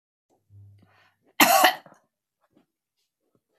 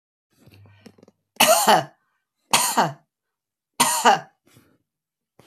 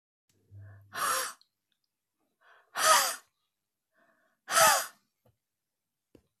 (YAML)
cough_length: 3.6 s
cough_amplitude: 27057
cough_signal_mean_std_ratio: 0.25
three_cough_length: 5.5 s
three_cough_amplitude: 28170
three_cough_signal_mean_std_ratio: 0.36
exhalation_length: 6.4 s
exhalation_amplitude: 11222
exhalation_signal_mean_std_ratio: 0.31
survey_phase: beta (2021-08-13 to 2022-03-07)
age: 65+
gender: Female
wearing_mask: 'No'
symptom_none: true
smoker_status: Prefer not to say
respiratory_condition_asthma: true
respiratory_condition_other: false
recruitment_source: REACT
submission_delay: 0 days
covid_test_result: Negative
covid_test_method: RT-qPCR